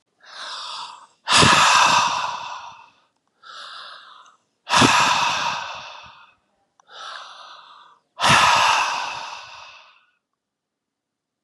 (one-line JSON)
{"exhalation_length": "11.4 s", "exhalation_amplitude": 29871, "exhalation_signal_mean_std_ratio": 0.46, "survey_phase": "beta (2021-08-13 to 2022-03-07)", "age": "45-64", "gender": "Male", "wearing_mask": "No", "symptom_none": true, "smoker_status": "Current smoker (e-cigarettes or vapes only)", "respiratory_condition_asthma": true, "respiratory_condition_other": false, "recruitment_source": "REACT", "submission_delay": "0 days", "covid_test_result": "Negative", "covid_test_method": "RT-qPCR", "influenza_a_test_result": "Negative", "influenza_b_test_result": "Negative"}